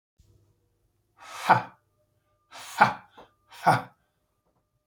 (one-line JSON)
{"exhalation_length": "4.9 s", "exhalation_amplitude": 23908, "exhalation_signal_mean_std_ratio": 0.24, "survey_phase": "beta (2021-08-13 to 2022-03-07)", "age": "65+", "gender": "Male", "wearing_mask": "No", "symptom_none": true, "smoker_status": "Never smoked", "respiratory_condition_asthma": true, "respiratory_condition_other": false, "recruitment_source": "REACT", "submission_delay": "2 days", "covid_test_result": "Negative", "covid_test_method": "RT-qPCR", "influenza_a_test_result": "Negative", "influenza_b_test_result": "Negative"}